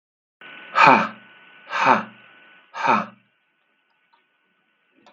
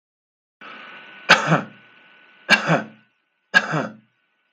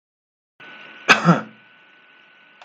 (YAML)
exhalation_length: 5.1 s
exhalation_amplitude: 32768
exhalation_signal_mean_std_ratio: 0.32
three_cough_length: 4.5 s
three_cough_amplitude: 32768
three_cough_signal_mean_std_ratio: 0.34
cough_length: 2.6 s
cough_amplitude: 32766
cough_signal_mean_std_ratio: 0.27
survey_phase: beta (2021-08-13 to 2022-03-07)
age: 45-64
gender: Male
wearing_mask: 'No'
symptom_change_to_sense_of_smell_or_taste: true
symptom_onset: 12 days
smoker_status: Current smoker (1 to 10 cigarettes per day)
respiratory_condition_asthma: false
respiratory_condition_other: false
recruitment_source: REACT
submission_delay: 1 day
covid_test_result: Negative
covid_test_method: RT-qPCR